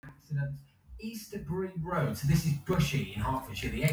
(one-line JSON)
{"cough_length": "3.9 s", "cough_amplitude": 5446, "cough_signal_mean_std_ratio": 0.78, "survey_phase": "beta (2021-08-13 to 2022-03-07)", "age": "65+", "gender": "Female", "wearing_mask": "No", "symptom_cough_any": true, "symptom_runny_or_blocked_nose": true, "symptom_sore_throat": true, "symptom_onset": "10 days", "smoker_status": "Never smoked", "respiratory_condition_asthma": false, "respiratory_condition_other": false, "recruitment_source": "REACT", "submission_delay": "2 days", "covid_test_result": "Negative", "covid_test_method": "RT-qPCR"}